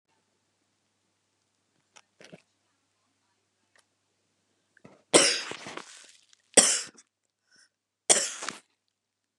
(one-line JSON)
{"cough_length": "9.4 s", "cough_amplitude": 29895, "cough_signal_mean_std_ratio": 0.21, "survey_phase": "beta (2021-08-13 to 2022-03-07)", "age": "65+", "gender": "Female", "wearing_mask": "No", "symptom_none": true, "smoker_status": "Never smoked", "respiratory_condition_asthma": false, "respiratory_condition_other": false, "recruitment_source": "REACT", "submission_delay": "1 day", "covid_test_result": "Negative", "covid_test_method": "RT-qPCR", "influenza_a_test_result": "Negative", "influenza_b_test_result": "Negative"}